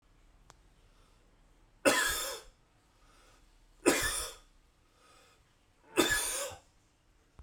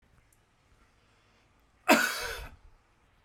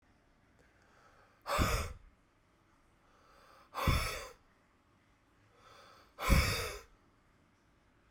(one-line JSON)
{"three_cough_length": "7.4 s", "three_cough_amplitude": 10007, "three_cough_signal_mean_std_ratio": 0.35, "cough_length": "3.2 s", "cough_amplitude": 15804, "cough_signal_mean_std_ratio": 0.27, "exhalation_length": "8.1 s", "exhalation_amplitude": 7617, "exhalation_signal_mean_std_ratio": 0.34, "survey_phase": "beta (2021-08-13 to 2022-03-07)", "age": "18-44", "gender": "Male", "wearing_mask": "No", "symptom_cough_any": true, "symptom_runny_or_blocked_nose": true, "symptom_sore_throat": true, "symptom_fatigue": true, "symptom_headache": true, "smoker_status": "Never smoked", "respiratory_condition_asthma": false, "respiratory_condition_other": false, "recruitment_source": "Test and Trace", "submission_delay": "1 day", "covid_test_result": "Positive", "covid_test_method": "RT-qPCR", "covid_ct_value": 19.0, "covid_ct_gene": "ORF1ab gene", "covid_ct_mean": 19.5, "covid_viral_load": "400000 copies/ml", "covid_viral_load_category": "Low viral load (10K-1M copies/ml)"}